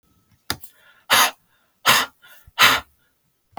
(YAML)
exhalation_length: 3.6 s
exhalation_amplitude: 28863
exhalation_signal_mean_std_ratio: 0.34
survey_phase: beta (2021-08-13 to 2022-03-07)
age: 45-64
gender: Female
wearing_mask: 'No'
symptom_runny_or_blocked_nose: true
symptom_sore_throat: true
symptom_onset: 12 days
smoker_status: Never smoked
respiratory_condition_asthma: false
respiratory_condition_other: false
recruitment_source: REACT
submission_delay: 1 day
covid_test_result: Negative
covid_test_method: RT-qPCR